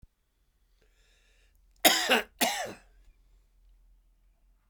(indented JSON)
{
  "cough_length": "4.7 s",
  "cough_amplitude": 18277,
  "cough_signal_mean_std_ratio": 0.28,
  "survey_phase": "beta (2021-08-13 to 2022-03-07)",
  "age": "65+",
  "gender": "Male",
  "wearing_mask": "No",
  "symptom_cough_any": true,
  "symptom_runny_or_blocked_nose": true,
  "symptom_shortness_of_breath": true,
  "symptom_fatigue": true,
  "symptom_change_to_sense_of_smell_or_taste": true,
  "symptom_onset": "3 days",
  "smoker_status": "Ex-smoker",
  "respiratory_condition_asthma": false,
  "respiratory_condition_other": false,
  "recruitment_source": "Test and Trace",
  "submission_delay": "2 days",
  "covid_test_result": "Positive",
  "covid_test_method": "ePCR"
}